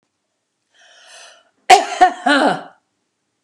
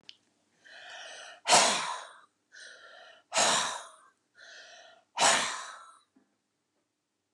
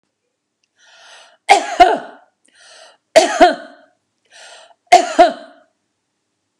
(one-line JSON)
{"cough_length": "3.4 s", "cough_amplitude": 32768, "cough_signal_mean_std_ratio": 0.33, "exhalation_length": "7.3 s", "exhalation_amplitude": 11946, "exhalation_signal_mean_std_ratio": 0.36, "three_cough_length": "6.6 s", "three_cough_amplitude": 32768, "three_cough_signal_mean_std_ratio": 0.31, "survey_phase": "beta (2021-08-13 to 2022-03-07)", "age": "45-64", "gender": "Female", "wearing_mask": "No", "symptom_none": true, "smoker_status": "Ex-smoker", "respiratory_condition_asthma": true, "respiratory_condition_other": false, "recruitment_source": "REACT", "submission_delay": "4 days", "covid_test_result": "Negative", "covid_test_method": "RT-qPCR", "influenza_a_test_result": "Negative", "influenza_b_test_result": "Negative"}